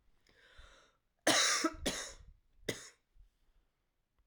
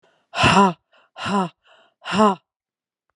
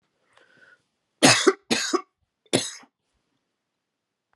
{"cough_length": "4.3 s", "cough_amplitude": 5869, "cough_signal_mean_std_ratio": 0.34, "exhalation_length": "3.2 s", "exhalation_amplitude": 27745, "exhalation_signal_mean_std_ratio": 0.4, "three_cough_length": "4.4 s", "three_cough_amplitude": 29118, "three_cough_signal_mean_std_ratio": 0.28, "survey_phase": "alpha (2021-03-01 to 2021-08-12)", "age": "45-64", "gender": "Female", "wearing_mask": "No", "symptom_cough_any": true, "symptom_shortness_of_breath": true, "symptom_fatigue": true, "smoker_status": "Never smoked", "respiratory_condition_asthma": false, "respiratory_condition_other": false, "recruitment_source": "Test and Trace", "submission_delay": "2 days", "covid_test_result": "Positive", "covid_test_method": "RT-qPCR"}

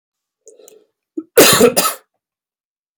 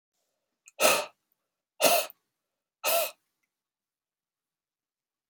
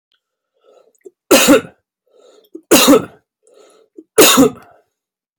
{"cough_length": "3.0 s", "cough_amplitude": 32768, "cough_signal_mean_std_ratio": 0.34, "exhalation_length": "5.3 s", "exhalation_amplitude": 14211, "exhalation_signal_mean_std_ratio": 0.28, "three_cough_length": "5.4 s", "three_cough_amplitude": 32768, "three_cough_signal_mean_std_ratio": 0.36, "survey_phase": "beta (2021-08-13 to 2022-03-07)", "age": "45-64", "gender": "Male", "wearing_mask": "No", "symptom_cough_any": true, "symptom_runny_or_blocked_nose": true, "symptom_sore_throat": true, "symptom_onset": "7 days", "smoker_status": "Never smoked", "respiratory_condition_asthma": false, "respiratory_condition_other": false, "recruitment_source": "Test and Trace", "submission_delay": "0 days", "covid_test_result": "Positive", "covid_test_method": "RT-qPCR", "covid_ct_value": 17.4, "covid_ct_gene": "N gene", "covid_ct_mean": 18.1, "covid_viral_load": "1200000 copies/ml", "covid_viral_load_category": "High viral load (>1M copies/ml)"}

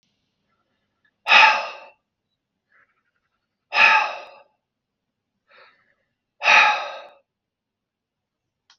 {"exhalation_length": "8.8 s", "exhalation_amplitude": 32545, "exhalation_signal_mean_std_ratio": 0.28, "survey_phase": "beta (2021-08-13 to 2022-03-07)", "age": "45-64", "gender": "Male", "wearing_mask": "No", "symptom_none": true, "smoker_status": "Ex-smoker", "respiratory_condition_asthma": false, "respiratory_condition_other": false, "recruitment_source": "REACT", "submission_delay": "1 day", "covid_test_result": "Negative", "covid_test_method": "RT-qPCR"}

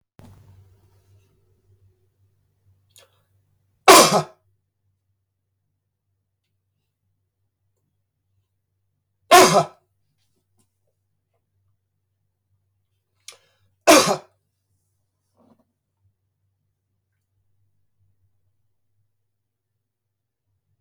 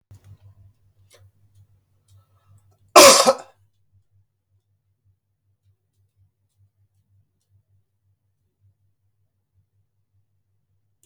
{"three_cough_length": "20.8 s", "three_cough_amplitude": 32768, "three_cough_signal_mean_std_ratio": 0.17, "cough_length": "11.1 s", "cough_amplitude": 32768, "cough_signal_mean_std_ratio": 0.15, "survey_phase": "beta (2021-08-13 to 2022-03-07)", "age": "45-64", "gender": "Male", "wearing_mask": "No", "symptom_none": true, "smoker_status": "Ex-smoker", "respiratory_condition_asthma": false, "respiratory_condition_other": false, "recruitment_source": "REACT", "submission_delay": "1 day", "covid_test_result": "Negative", "covid_test_method": "RT-qPCR", "influenza_a_test_result": "Unknown/Void", "influenza_b_test_result": "Unknown/Void"}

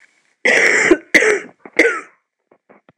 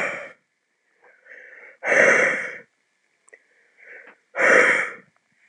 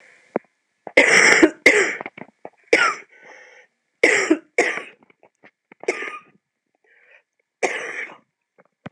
{"cough_length": "3.0 s", "cough_amplitude": 26028, "cough_signal_mean_std_ratio": 0.48, "exhalation_length": "5.5 s", "exhalation_amplitude": 25958, "exhalation_signal_mean_std_ratio": 0.4, "three_cough_length": "8.9 s", "three_cough_amplitude": 26028, "three_cough_signal_mean_std_ratio": 0.36, "survey_phase": "alpha (2021-03-01 to 2021-08-12)", "age": "18-44", "gender": "Female", "wearing_mask": "No", "symptom_cough_any": true, "symptom_shortness_of_breath": true, "symptom_headache": true, "symptom_change_to_sense_of_smell_or_taste": true, "symptom_loss_of_taste": true, "symptom_onset": "13 days", "smoker_status": "Ex-smoker", "respiratory_condition_asthma": true, "respiratory_condition_other": false, "recruitment_source": "Test and Trace", "submission_delay": "2 days", "covid_test_result": "Positive", "covid_test_method": "RT-qPCR", "covid_ct_value": 21.5, "covid_ct_gene": "ORF1ab gene"}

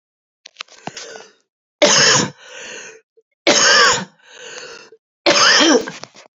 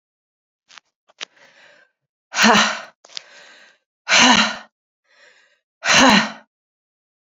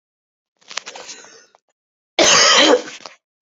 {"three_cough_length": "6.4 s", "three_cough_amplitude": 32768, "three_cough_signal_mean_std_ratio": 0.46, "exhalation_length": "7.3 s", "exhalation_amplitude": 32768, "exhalation_signal_mean_std_ratio": 0.34, "cough_length": "3.4 s", "cough_amplitude": 32768, "cough_signal_mean_std_ratio": 0.39, "survey_phase": "alpha (2021-03-01 to 2021-08-12)", "age": "18-44", "gender": "Female", "wearing_mask": "No", "symptom_cough_any": true, "symptom_new_continuous_cough": true, "symptom_fatigue": true, "symptom_headache": true, "symptom_change_to_sense_of_smell_or_taste": true, "symptom_onset": "5 days", "smoker_status": "Never smoked", "respiratory_condition_asthma": false, "respiratory_condition_other": false, "recruitment_source": "Test and Trace", "submission_delay": "1 day", "covid_test_result": "Positive", "covid_test_method": "RT-qPCR", "covid_ct_value": 14.9, "covid_ct_gene": "ORF1ab gene", "covid_ct_mean": 15.1, "covid_viral_load": "11000000 copies/ml", "covid_viral_load_category": "High viral load (>1M copies/ml)"}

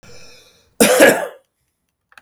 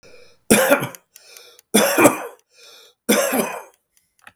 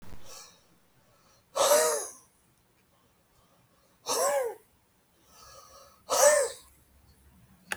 {"cough_length": "2.2 s", "cough_amplitude": 32768, "cough_signal_mean_std_ratio": 0.37, "three_cough_length": "4.4 s", "three_cough_amplitude": 32768, "three_cough_signal_mean_std_ratio": 0.43, "exhalation_length": "7.8 s", "exhalation_amplitude": 13412, "exhalation_signal_mean_std_ratio": 0.37, "survey_phase": "beta (2021-08-13 to 2022-03-07)", "age": "45-64", "gender": "Male", "wearing_mask": "No", "symptom_none": true, "smoker_status": "Ex-smoker", "respiratory_condition_asthma": false, "respiratory_condition_other": false, "recruitment_source": "REACT", "submission_delay": "3 days", "covid_test_result": "Negative", "covid_test_method": "RT-qPCR"}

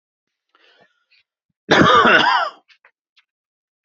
{"cough_length": "3.8 s", "cough_amplitude": 27918, "cough_signal_mean_std_ratio": 0.37, "survey_phase": "beta (2021-08-13 to 2022-03-07)", "age": "45-64", "gender": "Male", "wearing_mask": "No", "symptom_none": true, "smoker_status": "Ex-smoker", "respiratory_condition_asthma": false, "respiratory_condition_other": false, "recruitment_source": "REACT", "submission_delay": "0 days", "covid_test_result": "Negative", "covid_test_method": "RT-qPCR", "influenza_a_test_result": "Negative", "influenza_b_test_result": "Negative"}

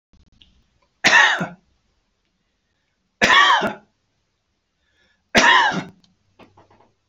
{"three_cough_length": "7.1 s", "three_cough_amplitude": 31232, "three_cough_signal_mean_std_ratio": 0.35, "survey_phase": "beta (2021-08-13 to 2022-03-07)", "age": "65+", "gender": "Male", "wearing_mask": "No", "symptom_change_to_sense_of_smell_or_taste": true, "smoker_status": "Never smoked", "respiratory_condition_asthma": false, "respiratory_condition_other": false, "recruitment_source": "REACT", "submission_delay": "1 day", "covid_test_result": "Negative", "covid_test_method": "RT-qPCR"}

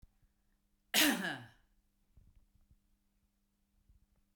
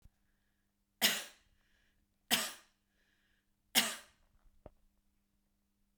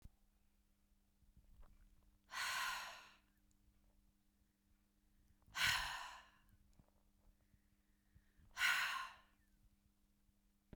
{"cough_length": "4.4 s", "cough_amplitude": 5522, "cough_signal_mean_std_ratio": 0.25, "three_cough_length": "6.0 s", "three_cough_amplitude": 7330, "three_cough_signal_mean_std_ratio": 0.24, "exhalation_length": "10.8 s", "exhalation_amplitude": 1952, "exhalation_signal_mean_std_ratio": 0.34, "survey_phase": "beta (2021-08-13 to 2022-03-07)", "age": "45-64", "gender": "Female", "wearing_mask": "No", "symptom_none": true, "smoker_status": "Never smoked", "respiratory_condition_asthma": true, "respiratory_condition_other": false, "recruitment_source": "Test and Trace", "submission_delay": "1 day", "covid_test_result": "Negative", "covid_test_method": "RT-qPCR"}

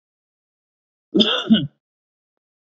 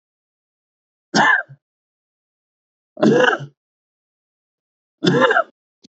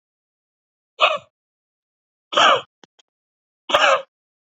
{"cough_length": "2.6 s", "cough_amplitude": 27221, "cough_signal_mean_std_ratio": 0.31, "three_cough_length": "6.0 s", "three_cough_amplitude": 29329, "three_cough_signal_mean_std_ratio": 0.34, "exhalation_length": "4.5 s", "exhalation_amplitude": 27408, "exhalation_signal_mean_std_ratio": 0.31, "survey_phase": "beta (2021-08-13 to 2022-03-07)", "age": "18-44", "gender": "Male", "wearing_mask": "No", "symptom_none": true, "smoker_status": "Current smoker (11 or more cigarettes per day)", "respiratory_condition_asthma": false, "respiratory_condition_other": false, "recruitment_source": "REACT", "submission_delay": "2 days", "covid_test_result": "Negative", "covid_test_method": "RT-qPCR", "influenza_a_test_result": "Negative", "influenza_b_test_result": "Negative"}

